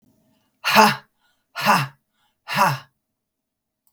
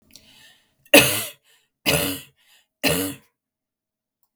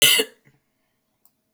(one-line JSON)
{"exhalation_length": "3.9 s", "exhalation_amplitude": 32768, "exhalation_signal_mean_std_ratio": 0.35, "three_cough_length": "4.4 s", "three_cough_amplitude": 32768, "three_cough_signal_mean_std_ratio": 0.31, "cough_length": "1.5 s", "cough_amplitude": 25244, "cough_signal_mean_std_ratio": 0.31, "survey_phase": "beta (2021-08-13 to 2022-03-07)", "age": "45-64", "gender": "Female", "wearing_mask": "No", "symptom_cough_any": true, "symptom_runny_or_blocked_nose": true, "symptom_sore_throat": true, "symptom_onset": "4 days", "smoker_status": "Never smoked", "respiratory_condition_asthma": false, "respiratory_condition_other": false, "recruitment_source": "Test and Trace", "submission_delay": "2 days", "covid_test_result": "Positive", "covid_test_method": "LAMP"}